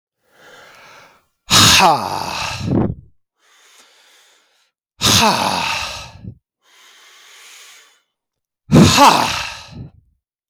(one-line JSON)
{"exhalation_length": "10.5 s", "exhalation_amplitude": 32768, "exhalation_signal_mean_std_ratio": 0.41, "survey_phase": "beta (2021-08-13 to 2022-03-07)", "age": "45-64", "gender": "Male", "wearing_mask": "No", "symptom_none": true, "smoker_status": "Never smoked", "respiratory_condition_asthma": false, "respiratory_condition_other": false, "recruitment_source": "REACT", "submission_delay": "0 days", "covid_test_result": "Negative", "covid_test_method": "RT-qPCR", "influenza_a_test_result": "Negative", "influenza_b_test_result": "Negative"}